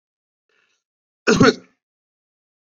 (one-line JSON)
{"cough_length": "2.6 s", "cough_amplitude": 28559, "cough_signal_mean_std_ratio": 0.24, "survey_phase": "beta (2021-08-13 to 2022-03-07)", "age": "18-44", "gender": "Male", "wearing_mask": "No", "symptom_none": true, "smoker_status": "Never smoked", "respiratory_condition_asthma": false, "respiratory_condition_other": false, "recruitment_source": "REACT", "submission_delay": "1 day", "covid_test_result": "Negative", "covid_test_method": "RT-qPCR", "influenza_a_test_result": "Negative", "influenza_b_test_result": "Negative"}